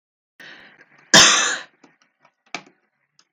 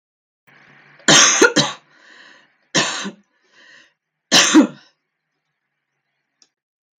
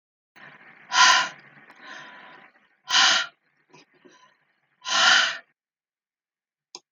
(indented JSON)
{
  "cough_length": "3.3 s",
  "cough_amplitude": 32768,
  "cough_signal_mean_std_ratio": 0.28,
  "three_cough_length": "7.0 s",
  "three_cough_amplitude": 32768,
  "three_cough_signal_mean_std_ratio": 0.32,
  "exhalation_length": "6.9 s",
  "exhalation_amplitude": 22731,
  "exhalation_signal_mean_std_ratio": 0.34,
  "survey_phase": "beta (2021-08-13 to 2022-03-07)",
  "age": "45-64",
  "gender": "Female",
  "wearing_mask": "No",
  "symptom_cough_any": true,
  "symptom_runny_or_blocked_nose": true,
  "symptom_shortness_of_breath": true,
  "symptom_onset": "4 days",
  "smoker_status": "Never smoked",
  "respiratory_condition_asthma": false,
  "respiratory_condition_other": false,
  "recruitment_source": "Test and Trace",
  "submission_delay": "1 day",
  "covid_test_result": "Negative",
  "covid_test_method": "RT-qPCR"
}